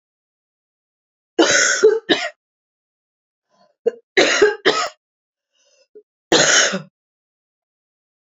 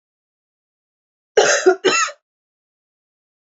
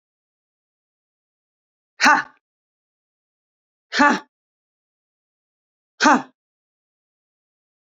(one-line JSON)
{"three_cough_length": "8.3 s", "three_cough_amplitude": 29376, "three_cough_signal_mean_std_ratio": 0.37, "cough_length": "3.5 s", "cough_amplitude": 27428, "cough_signal_mean_std_ratio": 0.32, "exhalation_length": "7.9 s", "exhalation_amplitude": 28896, "exhalation_signal_mean_std_ratio": 0.21, "survey_phase": "beta (2021-08-13 to 2022-03-07)", "age": "18-44", "gender": "Female", "wearing_mask": "No", "symptom_cough_any": true, "symptom_runny_or_blocked_nose": true, "symptom_fatigue": true, "symptom_headache": true, "smoker_status": "Never smoked", "respiratory_condition_asthma": false, "respiratory_condition_other": false, "recruitment_source": "REACT", "submission_delay": "2 days", "covid_test_result": "Positive", "covid_test_method": "RT-qPCR", "covid_ct_value": 18.0, "covid_ct_gene": "E gene", "influenza_a_test_result": "Negative", "influenza_b_test_result": "Negative"}